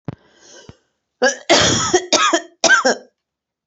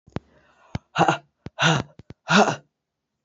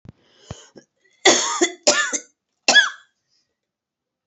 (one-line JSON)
{"cough_length": "3.7 s", "cough_amplitude": 32768, "cough_signal_mean_std_ratio": 0.49, "exhalation_length": "3.2 s", "exhalation_amplitude": 24903, "exhalation_signal_mean_std_ratio": 0.36, "three_cough_length": "4.3 s", "three_cough_amplitude": 29677, "three_cough_signal_mean_std_ratio": 0.34, "survey_phase": "alpha (2021-03-01 to 2021-08-12)", "age": "45-64", "gender": "Female", "wearing_mask": "No", "symptom_cough_any": true, "symptom_headache": true, "smoker_status": "Ex-smoker", "respiratory_condition_asthma": false, "respiratory_condition_other": false, "recruitment_source": "Test and Trace", "submission_delay": "1 day", "covid_test_result": "Positive", "covid_test_method": "RT-qPCR", "covid_ct_value": 31.9, "covid_ct_gene": "ORF1ab gene", "covid_ct_mean": 32.2, "covid_viral_load": "28 copies/ml", "covid_viral_load_category": "Minimal viral load (< 10K copies/ml)"}